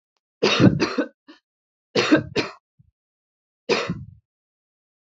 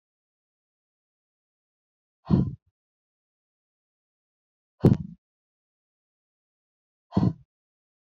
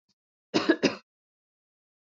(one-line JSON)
{"three_cough_length": "5.0 s", "three_cough_amplitude": 26278, "three_cough_signal_mean_std_ratio": 0.36, "exhalation_length": "8.2 s", "exhalation_amplitude": 17929, "exhalation_signal_mean_std_ratio": 0.18, "cough_length": "2.0 s", "cough_amplitude": 13072, "cough_signal_mean_std_ratio": 0.27, "survey_phase": "beta (2021-08-13 to 2022-03-07)", "age": "18-44", "gender": "Female", "wearing_mask": "No", "symptom_cough_any": true, "symptom_runny_or_blocked_nose": true, "symptom_sore_throat": true, "symptom_fatigue": true, "symptom_headache": true, "symptom_onset": "4 days", "smoker_status": "Never smoked", "respiratory_condition_asthma": false, "respiratory_condition_other": false, "recruitment_source": "REACT", "submission_delay": "5 days", "covid_test_result": "Negative", "covid_test_method": "RT-qPCR", "influenza_a_test_result": "Negative", "influenza_b_test_result": "Negative"}